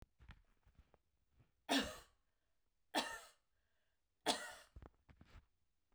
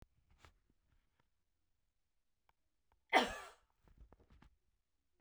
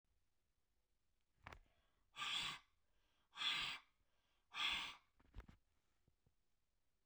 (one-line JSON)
{"three_cough_length": "5.9 s", "three_cough_amplitude": 2366, "three_cough_signal_mean_std_ratio": 0.28, "cough_length": "5.2 s", "cough_amplitude": 4281, "cough_signal_mean_std_ratio": 0.17, "exhalation_length": "7.1 s", "exhalation_amplitude": 1042, "exhalation_signal_mean_std_ratio": 0.37, "survey_phase": "beta (2021-08-13 to 2022-03-07)", "age": "45-64", "gender": "Female", "wearing_mask": "No", "symptom_none": true, "symptom_onset": "3 days", "smoker_status": "Never smoked", "respiratory_condition_asthma": false, "respiratory_condition_other": false, "recruitment_source": "REACT", "submission_delay": "1 day", "covid_test_result": "Negative", "covid_test_method": "RT-qPCR"}